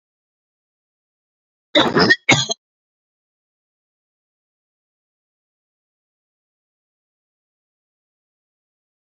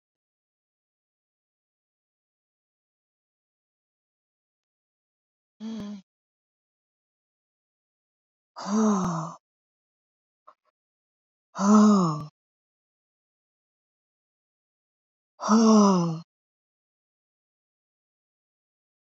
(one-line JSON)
{"cough_length": "9.1 s", "cough_amplitude": 31583, "cough_signal_mean_std_ratio": 0.19, "exhalation_length": "19.1 s", "exhalation_amplitude": 14694, "exhalation_signal_mean_std_ratio": 0.26, "survey_phase": "beta (2021-08-13 to 2022-03-07)", "age": "18-44", "gender": "Female", "wearing_mask": "No", "symptom_sore_throat": true, "smoker_status": "Never smoked", "respiratory_condition_asthma": false, "respiratory_condition_other": false, "recruitment_source": "REACT", "submission_delay": "2 days", "covid_test_result": "Negative", "covid_test_method": "RT-qPCR", "influenza_a_test_result": "Unknown/Void", "influenza_b_test_result": "Unknown/Void"}